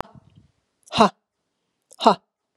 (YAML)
exhalation_length: 2.6 s
exhalation_amplitude: 31904
exhalation_signal_mean_std_ratio: 0.23
survey_phase: beta (2021-08-13 to 2022-03-07)
age: 45-64
gender: Female
wearing_mask: 'No'
symptom_runny_or_blocked_nose: true
symptom_onset: 3 days
smoker_status: Never smoked
respiratory_condition_asthma: false
respiratory_condition_other: false
recruitment_source: Test and Trace
submission_delay: 2 days
covid_test_result: Positive
covid_test_method: RT-qPCR
covid_ct_value: 19.1
covid_ct_gene: ORF1ab gene
covid_ct_mean: 19.6
covid_viral_load: 380000 copies/ml
covid_viral_load_category: Low viral load (10K-1M copies/ml)